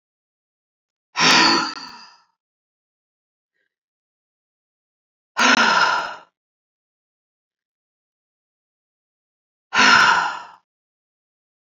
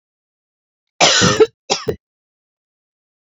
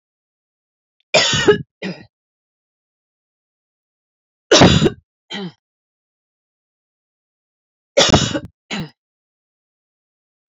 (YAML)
exhalation_length: 11.6 s
exhalation_amplitude: 27473
exhalation_signal_mean_std_ratio: 0.32
cough_length: 3.3 s
cough_amplitude: 31597
cough_signal_mean_std_ratio: 0.33
three_cough_length: 10.5 s
three_cough_amplitude: 31379
three_cough_signal_mean_std_ratio: 0.28
survey_phase: beta (2021-08-13 to 2022-03-07)
age: 45-64
gender: Female
wearing_mask: 'No'
symptom_headache: true
smoker_status: Never smoked
respiratory_condition_asthma: false
respiratory_condition_other: false
recruitment_source: REACT
submission_delay: 3 days
covid_test_result: Negative
covid_test_method: RT-qPCR
influenza_a_test_result: Negative
influenza_b_test_result: Negative